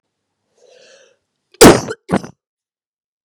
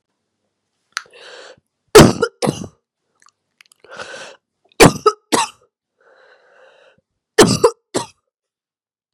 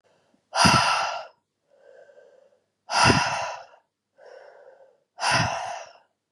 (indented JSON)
{
  "cough_length": "3.2 s",
  "cough_amplitude": 32768,
  "cough_signal_mean_std_ratio": 0.24,
  "three_cough_length": "9.1 s",
  "three_cough_amplitude": 32768,
  "three_cough_signal_mean_std_ratio": 0.25,
  "exhalation_length": "6.3 s",
  "exhalation_amplitude": 23551,
  "exhalation_signal_mean_std_ratio": 0.43,
  "survey_phase": "beta (2021-08-13 to 2022-03-07)",
  "age": "18-44",
  "gender": "Female",
  "wearing_mask": "No",
  "symptom_cough_any": true,
  "symptom_new_continuous_cough": true,
  "symptom_runny_or_blocked_nose": true,
  "symptom_fatigue": true,
  "symptom_fever_high_temperature": true,
  "symptom_headache": true,
  "symptom_onset": "2 days",
  "smoker_status": "Ex-smoker",
  "respiratory_condition_asthma": false,
  "respiratory_condition_other": false,
  "recruitment_source": "Test and Trace",
  "submission_delay": "1 day",
  "covid_test_result": "Positive",
  "covid_test_method": "RT-qPCR",
  "covid_ct_value": 26.8,
  "covid_ct_gene": "ORF1ab gene",
  "covid_ct_mean": 27.3,
  "covid_viral_load": "1100 copies/ml",
  "covid_viral_load_category": "Minimal viral load (< 10K copies/ml)"
}